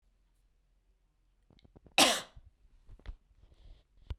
cough_length: 4.2 s
cough_amplitude: 11715
cough_signal_mean_std_ratio: 0.22
survey_phase: beta (2021-08-13 to 2022-03-07)
age: 45-64
gender: Female
wearing_mask: 'No'
symptom_none: true
smoker_status: Never smoked
respiratory_condition_asthma: false
respiratory_condition_other: false
recruitment_source: REACT
submission_delay: 0 days
covid_test_result: Negative
covid_test_method: RT-qPCR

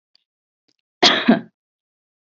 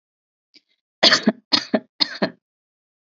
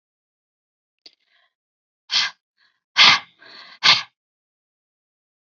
cough_length: 2.3 s
cough_amplitude: 29189
cough_signal_mean_std_ratio: 0.28
three_cough_length: 3.1 s
three_cough_amplitude: 29878
three_cough_signal_mean_std_ratio: 0.29
exhalation_length: 5.5 s
exhalation_amplitude: 32308
exhalation_signal_mean_std_ratio: 0.24
survey_phase: beta (2021-08-13 to 2022-03-07)
age: 18-44
gender: Female
wearing_mask: 'Yes'
symptom_none: true
smoker_status: Never smoked
respiratory_condition_asthma: false
respiratory_condition_other: false
recruitment_source: REACT
submission_delay: 1 day
covid_test_result: Negative
covid_test_method: RT-qPCR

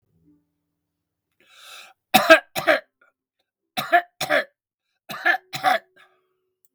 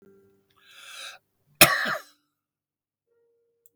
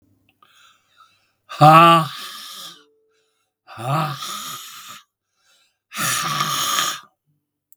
three_cough_length: 6.7 s
three_cough_amplitude: 32766
three_cough_signal_mean_std_ratio: 0.29
cough_length: 3.8 s
cough_amplitude: 32768
cough_signal_mean_std_ratio: 0.21
exhalation_length: 7.8 s
exhalation_amplitude: 32768
exhalation_signal_mean_std_ratio: 0.36
survey_phase: beta (2021-08-13 to 2022-03-07)
age: 65+
gender: Male
wearing_mask: 'No'
symptom_none: true
smoker_status: Ex-smoker
respiratory_condition_asthma: false
respiratory_condition_other: false
recruitment_source: REACT
submission_delay: 3 days
covid_test_result: Negative
covid_test_method: RT-qPCR
influenza_a_test_result: Negative
influenza_b_test_result: Negative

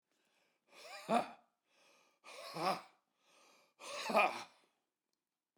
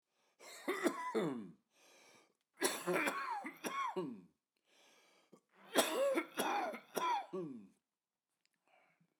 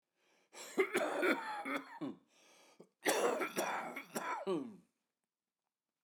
exhalation_length: 5.6 s
exhalation_amplitude: 4088
exhalation_signal_mean_std_ratio: 0.32
three_cough_length: 9.2 s
three_cough_amplitude: 4457
three_cough_signal_mean_std_ratio: 0.53
cough_length: 6.0 s
cough_amplitude: 4117
cough_signal_mean_std_ratio: 0.54
survey_phase: beta (2021-08-13 to 2022-03-07)
age: 45-64
gender: Male
wearing_mask: 'No'
symptom_cough_any: true
symptom_shortness_of_breath: true
symptom_fatigue: true
smoker_status: Never smoked
respiratory_condition_asthma: false
respiratory_condition_other: false
recruitment_source: REACT
submission_delay: 2 days
covid_test_result: Negative
covid_test_method: RT-qPCR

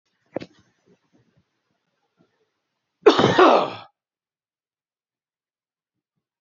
cough_length: 6.4 s
cough_amplitude: 27491
cough_signal_mean_std_ratio: 0.23
survey_phase: beta (2021-08-13 to 2022-03-07)
age: 45-64
gender: Male
wearing_mask: 'No'
symptom_cough_any: true
symptom_runny_or_blocked_nose: true
symptom_sore_throat: true
symptom_fatigue: true
symptom_fever_high_temperature: true
symptom_headache: true
symptom_change_to_sense_of_smell_or_taste: true
smoker_status: Ex-smoker
respiratory_condition_asthma: false
respiratory_condition_other: false
recruitment_source: Test and Trace
submission_delay: 2 days
covid_test_result: Positive
covid_test_method: LFT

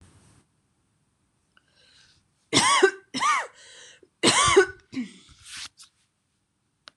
three_cough_length: 7.0 s
three_cough_amplitude: 19086
three_cough_signal_mean_std_ratio: 0.34
survey_phase: beta (2021-08-13 to 2022-03-07)
age: 45-64
gender: Female
wearing_mask: 'No'
symptom_cough_any: true
symptom_onset: 11 days
smoker_status: Never smoked
respiratory_condition_asthma: false
respiratory_condition_other: false
recruitment_source: REACT
submission_delay: 1 day
covid_test_result: Negative
covid_test_method: RT-qPCR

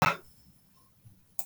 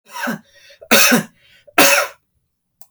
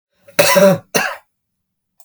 exhalation_length: 1.5 s
exhalation_amplitude: 14516
exhalation_signal_mean_std_ratio: 0.27
three_cough_length: 2.9 s
three_cough_amplitude: 32768
three_cough_signal_mean_std_ratio: 0.42
cough_length: 2.0 s
cough_amplitude: 32768
cough_signal_mean_std_ratio: 0.43
survey_phase: beta (2021-08-13 to 2022-03-07)
age: 45-64
gender: Male
wearing_mask: 'No'
symptom_none: true
smoker_status: Never smoked
respiratory_condition_asthma: false
respiratory_condition_other: false
recruitment_source: REACT
submission_delay: 3 days
covid_test_result: Negative
covid_test_method: RT-qPCR
influenza_a_test_result: Negative
influenza_b_test_result: Negative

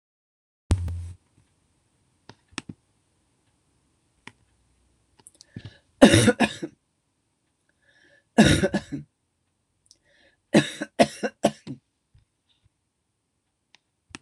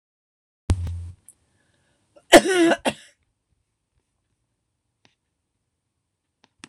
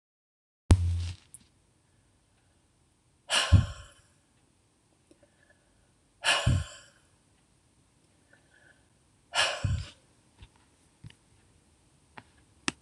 three_cough_length: 14.2 s
three_cough_amplitude: 26028
three_cough_signal_mean_std_ratio: 0.23
cough_length: 6.7 s
cough_amplitude: 26028
cough_signal_mean_std_ratio: 0.22
exhalation_length: 12.8 s
exhalation_amplitude: 15452
exhalation_signal_mean_std_ratio: 0.27
survey_phase: beta (2021-08-13 to 2022-03-07)
age: 65+
gender: Female
wearing_mask: 'No'
symptom_none: true
symptom_onset: 12 days
smoker_status: Never smoked
respiratory_condition_asthma: false
respiratory_condition_other: false
recruitment_source: REACT
submission_delay: 3 days
covid_test_result: Negative
covid_test_method: RT-qPCR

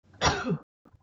cough_length: 1.0 s
cough_amplitude: 11712
cough_signal_mean_std_ratio: 0.48
survey_phase: beta (2021-08-13 to 2022-03-07)
age: 45-64
gender: Female
wearing_mask: 'Yes'
symptom_none: true
symptom_onset: 6 days
smoker_status: Never smoked
respiratory_condition_asthma: false
respiratory_condition_other: false
recruitment_source: REACT
submission_delay: 21 days
covid_test_result: Negative
covid_test_method: RT-qPCR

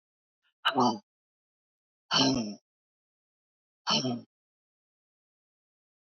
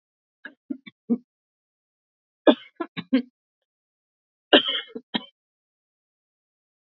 exhalation_length: 6.1 s
exhalation_amplitude: 8897
exhalation_signal_mean_std_ratio: 0.32
three_cough_length: 7.0 s
three_cough_amplitude: 28379
three_cough_signal_mean_std_ratio: 0.2
survey_phase: beta (2021-08-13 to 2022-03-07)
age: 65+
gender: Female
wearing_mask: 'No'
symptom_cough_any: true
symptom_onset: 12 days
smoker_status: Ex-smoker
respiratory_condition_asthma: false
respiratory_condition_other: false
recruitment_source: REACT
submission_delay: 3 days
covid_test_result: Negative
covid_test_method: RT-qPCR
influenza_a_test_result: Negative
influenza_b_test_result: Negative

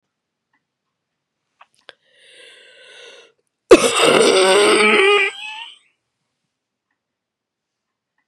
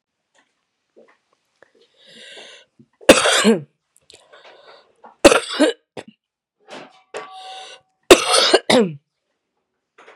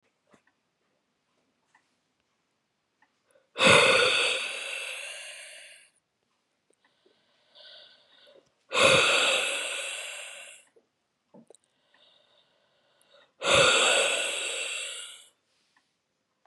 cough_length: 8.3 s
cough_amplitude: 32768
cough_signal_mean_std_ratio: 0.36
three_cough_length: 10.2 s
three_cough_amplitude: 32768
three_cough_signal_mean_std_ratio: 0.29
exhalation_length: 16.5 s
exhalation_amplitude: 16588
exhalation_signal_mean_std_ratio: 0.38
survey_phase: beta (2021-08-13 to 2022-03-07)
age: 45-64
gender: Female
wearing_mask: 'No'
symptom_cough_any: true
symptom_runny_or_blocked_nose: true
symptom_sore_throat: true
symptom_diarrhoea: true
symptom_fatigue: true
symptom_headache: true
symptom_onset: 7 days
smoker_status: Never smoked
respiratory_condition_asthma: false
respiratory_condition_other: false
recruitment_source: Test and Trace
submission_delay: 2 days
covid_test_result: Positive
covid_test_method: RT-qPCR
covid_ct_value: 25.7
covid_ct_gene: N gene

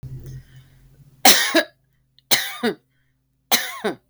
three_cough_length: 4.1 s
three_cough_amplitude: 32768
three_cough_signal_mean_std_ratio: 0.35
survey_phase: beta (2021-08-13 to 2022-03-07)
age: 45-64
gender: Female
wearing_mask: 'No'
symptom_runny_or_blocked_nose: true
symptom_fatigue: true
symptom_headache: true
symptom_onset: 12 days
smoker_status: Never smoked
respiratory_condition_asthma: false
respiratory_condition_other: false
recruitment_source: REACT
submission_delay: 2 days
covid_test_result: Negative
covid_test_method: RT-qPCR
influenza_a_test_result: Negative
influenza_b_test_result: Negative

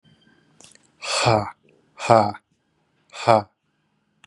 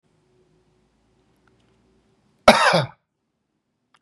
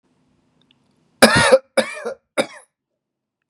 exhalation_length: 4.3 s
exhalation_amplitude: 32688
exhalation_signal_mean_std_ratio: 0.31
cough_length: 4.0 s
cough_amplitude: 32768
cough_signal_mean_std_ratio: 0.22
three_cough_length: 3.5 s
three_cough_amplitude: 32768
three_cough_signal_mean_std_ratio: 0.3
survey_phase: beta (2021-08-13 to 2022-03-07)
age: 18-44
gender: Male
wearing_mask: 'No'
symptom_none: true
smoker_status: Prefer not to say
respiratory_condition_asthma: false
respiratory_condition_other: false
recruitment_source: REACT
submission_delay: 1 day
covid_test_result: Negative
covid_test_method: RT-qPCR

